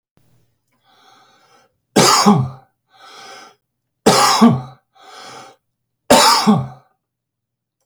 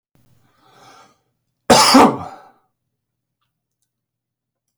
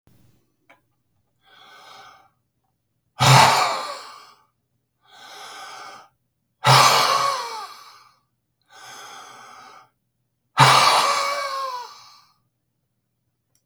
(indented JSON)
{
  "three_cough_length": "7.9 s",
  "three_cough_amplitude": 32768,
  "three_cough_signal_mean_std_ratio": 0.38,
  "cough_length": "4.8 s",
  "cough_amplitude": 32768,
  "cough_signal_mean_std_ratio": 0.26,
  "exhalation_length": "13.7 s",
  "exhalation_amplitude": 32768,
  "exhalation_signal_mean_std_ratio": 0.36,
  "survey_phase": "beta (2021-08-13 to 2022-03-07)",
  "age": "65+",
  "gender": "Male",
  "wearing_mask": "No",
  "symptom_none": true,
  "symptom_onset": "11 days",
  "smoker_status": "Never smoked",
  "respiratory_condition_asthma": false,
  "respiratory_condition_other": false,
  "recruitment_source": "REACT",
  "submission_delay": "1 day",
  "covid_test_result": "Negative",
  "covid_test_method": "RT-qPCR",
  "influenza_a_test_result": "Negative",
  "influenza_b_test_result": "Negative"
}